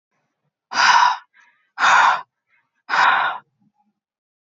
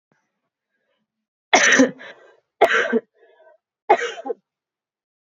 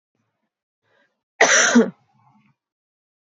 exhalation_length: 4.4 s
exhalation_amplitude: 24488
exhalation_signal_mean_std_ratio: 0.45
three_cough_length: 5.2 s
three_cough_amplitude: 25807
three_cough_signal_mean_std_ratio: 0.33
cough_length: 3.2 s
cough_amplitude: 28996
cough_signal_mean_std_ratio: 0.3
survey_phase: beta (2021-08-13 to 2022-03-07)
age: 18-44
gender: Female
wearing_mask: 'No'
symptom_none: true
smoker_status: Never smoked
respiratory_condition_asthma: false
respiratory_condition_other: false
recruitment_source: Test and Trace
submission_delay: 1 day
covid_test_result: Negative
covid_test_method: RT-qPCR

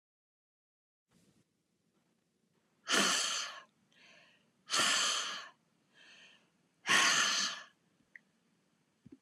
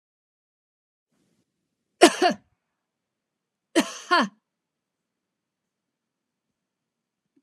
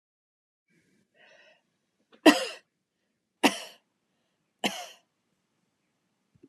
exhalation_length: 9.2 s
exhalation_amplitude: 6335
exhalation_signal_mean_std_ratio: 0.38
cough_length: 7.4 s
cough_amplitude: 31565
cough_signal_mean_std_ratio: 0.19
three_cough_length: 6.5 s
three_cough_amplitude: 23144
three_cough_signal_mean_std_ratio: 0.17
survey_phase: beta (2021-08-13 to 2022-03-07)
age: 45-64
gender: Female
wearing_mask: 'No'
symptom_none: true
smoker_status: Ex-smoker
respiratory_condition_asthma: false
respiratory_condition_other: false
recruitment_source: REACT
submission_delay: 13 days
covid_test_result: Negative
covid_test_method: RT-qPCR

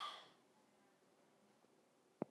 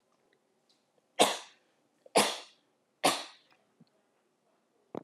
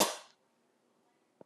exhalation_length: 2.3 s
exhalation_amplitude: 1368
exhalation_signal_mean_std_ratio: 0.32
three_cough_length: 5.0 s
three_cough_amplitude: 13044
three_cough_signal_mean_std_ratio: 0.25
cough_length: 1.5 s
cough_amplitude: 7126
cough_signal_mean_std_ratio: 0.24
survey_phase: alpha (2021-03-01 to 2021-08-12)
age: 18-44
gender: Female
wearing_mask: 'No'
symptom_none: true
smoker_status: Never smoked
respiratory_condition_asthma: false
respiratory_condition_other: false
recruitment_source: Test and Trace
submission_delay: 0 days
covid_test_result: Negative
covid_test_method: LFT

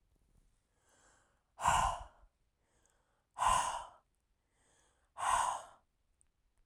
exhalation_length: 6.7 s
exhalation_amplitude: 4072
exhalation_signal_mean_std_ratio: 0.35
survey_phase: alpha (2021-03-01 to 2021-08-12)
age: 18-44
gender: Female
wearing_mask: 'No'
symptom_none: true
smoker_status: Never smoked
respiratory_condition_asthma: false
respiratory_condition_other: false
recruitment_source: REACT
submission_delay: 1 day
covid_test_result: Negative
covid_test_method: RT-qPCR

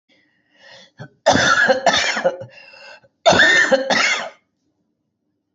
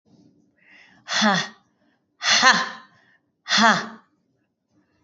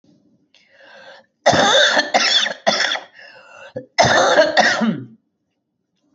three_cough_length: 5.5 s
three_cough_amplitude: 28820
three_cough_signal_mean_std_ratio: 0.51
exhalation_length: 5.0 s
exhalation_amplitude: 25939
exhalation_signal_mean_std_ratio: 0.37
cough_length: 6.1 s
cough_amplitude: 28133
cough_signal_mean_std_ratio: 0.53
survey_phase: beta (2021-08-13 to 2022-03-07)
age: 45-64
gender: Female
wearing_mask: 'No'
symptom_cough_any: true
symptom_shortness_of_breath: true
symptom_abdominal_pain: true
symptom_fatigue: true
symptom_change_to_sense_of_smell_or_taste: true
symptom_loss_of_taste: true
symptom_onset: 13 days
smoker_status: Current smoker (1 to 10 cigarettes per day)
respiratory_condition_asthma: false
respiratory_condition_other: false
recruitment_source: REACT
submission_delay: 4 days
covid_test_result: Negative
covid_test_method: RT-qPCR
influenza_a_test_result: Negative
influenza_b_test_result: Negative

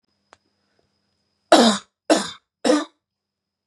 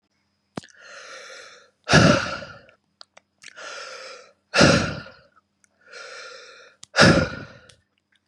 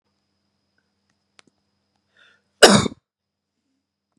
three_cough_length: 3.7 s
three_cough_amplitude: 31646
three_cough_signal_mean_std_ratio: 0.31
exhalation_length: 8.3 s
exhalation_amplitude: 29721
exhalation_signal_mean_std_ratio: 0.33
cough_length: 4.2 s
cough_amplitude: 32768
cough_signal_mean_std_ratio: 0.17
survey_phase: beta (2021-08-13 to 2022-03-07)
age: 18-44
gender: Male
wearing_mask: 'No'
symptom_none: true
smoker_status: Never smoked
respiratory_condition_asthma: false
respiratory_condition_other: false
recruitment_source: REACT
submission_delay: 2 days
covid_test_result: Negative
covid_test_method: RT-qPCR
influenza_a_test_result: Negative
influenza_b_test_result: Negative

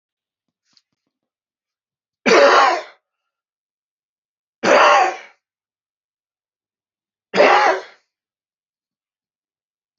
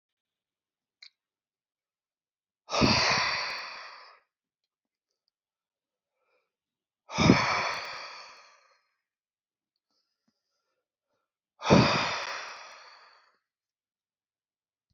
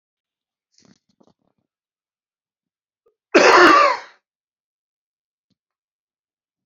three_cough_length: 10.0 s
three_cough_amplitude: 32174
three_cough_signal_mean_std_ratio: 0.31
exhalation_length: 14.9 s
exhalation_amplitude: 18394
exhalation_signal_mean_std_ratio: 0.3
cough_length: 6.7 s
cough_amplitude: 31539
cough_signal_mean_std_ratio: 0.25
survey_phase: beta (2021-08-13 to 2022-03-07)
age: 65+
gender: Male
wearing_mask: 'No'
symptom_none: true
symptom_onset: 6 days
smoker_status: Never smoked
respiratory_condition_asthma: false
respiratory_condition_other: false
recruitment_source: REACT
submission_delay: 1 day
covid_test_result: Negative
covid_test_method: RT-qPCR
influenza_a_test_result: Unknown/Void
influenza_b_test_result: Unknown/Void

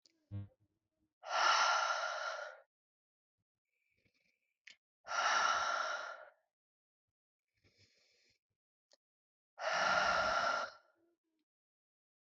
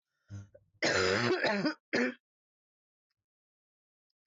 exhalation_length: 12.4 s
exhalation_amplitude: 3919
exhalation_signal_mean_std_ratio: 0.43
cough_length: 4.3 s
cough_amplitude: 4965
cough_signal_mean_std_ratio: 0.44
survey_phase: beta (2021-08-13 to 2022-03-07)
age: 18-44
gender: Female
wearing_mask: 'No'
symptom_cough_any: true
symptom_runny_or_blocked_nose: true
symptom_sore_throat: true
symptom_diarrhoea: true
symptom_fatigue: true
symptom_fever_high_temperature: true
symptom_headache: true
symptom_change_to_sense_of_smell_or_taste: true
symptom_onset: 3 days
smoker_status: Never smoked
respiratory_condition_asthma: false
respiratory_condition_other: false
recruitment_source: Test and Trace
submission_delay: 2 days
covid_test_result: Positive
covid_test_method: RT-qPCR
covid_ct_value: 24.9
covid_ct_gene: ORF1ab gene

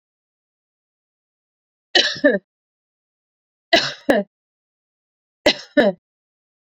three_cough_length: 6.7 s
three_cough_amplitude: 29363
three_cough_signal_mean_std_ratio: 0.27
survey_phase: beta (2021-08-13 to 2022-03-07)
age: 45-64
gender: Female
wearing_mask: 'No'
symptom_cough_any: true
smoker_status: Ex-smoker
respiratory_condition_asthma: false
respiratory_condition_other: false
recruitment_source: REACT
submission_delay: 2 days
covid_test_result: Negative
covid_test_method: RT-qPCR
influenza_a_test_result: Negative
influenza_b_test_result: Negative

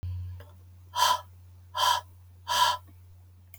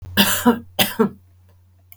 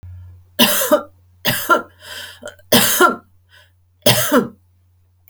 exhalation_length: 3.6 s
exhalation_amplitude: 9898
exhalation_signal_mean_std_ratio: 0.5
cough_length: 2.0 s
cough_amplitude: 32768
cough_signal_mean_std_ratio: 0.46
three_cough_length: 5.3 s
three_cough_amplitude: 32768
three_cough_signal_mean_std_ratio: 0.46
survey_phase: alpha (2021-03-01 to 2021-08-12)
age: 65+
gender: Female
wearing_mask: 'No'
symptom_none: true
smoker_status: Never smoked
respiratory_condition_asthma: false
respiratory_condition_other: false
recruitment_source: REACT
submission_delay: 2 days
covid_test_result: Negative
covid_test_method: RT-qPCR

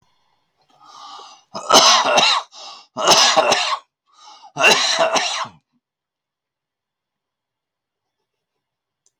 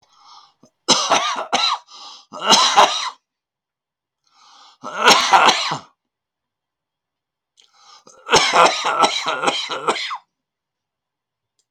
cough_length: 9.2 s
cough_amplitude: 32767
cough_signal_mean_std_ratio: 0.41
three_cough_length: 11.7 s
three_cough_amplitude: 32768
three_cough_signal_mean_std_ratio: 0.43
survey_phase: beta (2021-08-13 to 2022-03-07)
age: 65+
gender: Male
wearing_mask: 'No'
symptom_cough_any: true
symptom_new_continuous_cough: true
symptom_onset: 4 days
smoker_status: Ex-smoker
respiratory_condition_asthma: false
respiratory_condition_other: false
recruitment_source: Test and Trace
submission_delay: 1 day
covid_test_result: Negative
covid_test_method: RT-qPCR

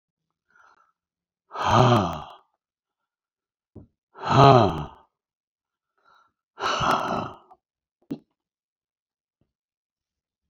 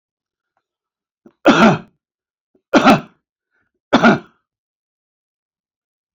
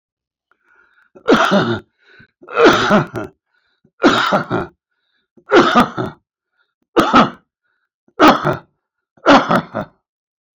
exhalation_length: 10.5 s
exhalation_amplitude: 31281
exhalation_signal_mean_std_ratio: 0.29
three_cough_length: 6.1 s
three_cough_amplitude: 28115
three_cough_signal_mean_std_ratio: 0.29
cough_length: 10.6 s
cough_amplitude: 32768
cough_signal_mean_std_ratio: 0.43
survey_phase: beta (2021-08-13 to 2022-03-07)
age: 65+
gender: Male
wearing_mask: 'No'
symptom_none: true
smoker_status: Ex-smoker
respiratory_condition_asthma: false
respiratory_condition_other: false
recruitment_source: REACT
submission_delay: 1 day
covid_test_result: Negative
covid_test_method: RT-qPCR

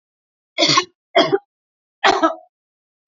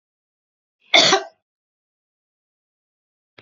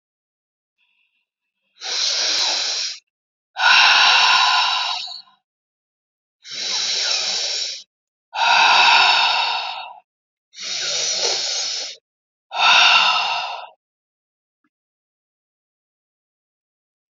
three_cough_length: 3.1 s
three_cough_amplitude: 27766
three_cough_signal_mean_std_ratio: 0.38
cough_length: 3.4 s
cough_amplitude: 31447
cough_signal_mean_std_ratio: 0.22
exhalation_length: 17.2 s
exhalation_amplitude: 28943
exhalation_signal_mean_std_ratio: 0.53
survey_phase: beta (2021-08-13 to 2022-03-07)
age: 45-64
gender: Female
wearing_mask: 'No'
symptom_none: true
smoker_status: Never smoked
respiratory_condition_asthma: false
respiratory_condition_other: false
recruitment_source: REACT
submission_delay: 2 days
covid_test_result: Negative
covid_test_method: RT-qPCR
influenza_a_test_result: Negative
influenza_b_test_result: Negative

